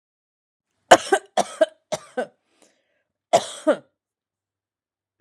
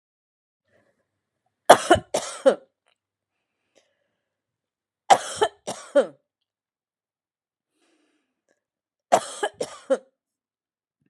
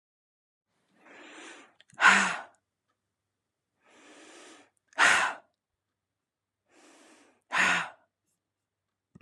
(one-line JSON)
{"cough_length": "5.2 s", "cough_amplitude": 32768, "cough_signal_mean_std_ratio": 0.23, "three_cough_length": "11.1 s", "three_cough_amplitude": 32767, "three_cough_signal_mean_std_ratio": 0.21, "exhalation_length": "9.2 s", "exhalation_amplitude": 15097, "exhalation_signal_mean_std_ratio": 0.27, "survey_phase": "alpha (2021-03-01 to 2021-08-12)", "age": "45-64", "gender": "Female", "wearing_mask": "No", "symptom_headache": true, "symptom_onset": "4 days", "smoker_status": "Ex-smoker", "respiratory_condition_asthma": false, "respiratory_condition_other": false, "recruitment_source": "REACT", "submission_delay": "1 day", "covid_test_result": "Negative", "covid_test_method": "RT-qPCR"}